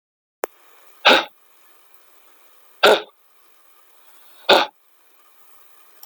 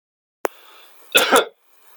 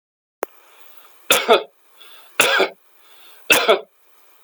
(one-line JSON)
{"exhalation_length": "6.1 s", "exhalation_amplitude": 32497, "exhalation_signal_mean_std_ratio": 0.25, "cough_length": "2.0 s", "cough_amplitude": 32768, "cough_signal_mean_std_ratio": 0.31, "three_cough_length": "4.4 s", "three_cough_amplitude": 32767, "three_cough_signal_mean_std_ratio": 0.36, "survey_phase": "beta (2021-08-13 to 2022-03-07)", "age": "65+", "gender": "Male", "wearing_mask": "No", "symptom_none": true, "smoker_status": "Never smoked", "respiratory_condition_asthma": false, "respiratory_condition_other": false, "recruitment_source": "REACT", "submission_delay": "2 days", "covid_test_result": "Negative", "covid_test_method": "RT-qPCR"}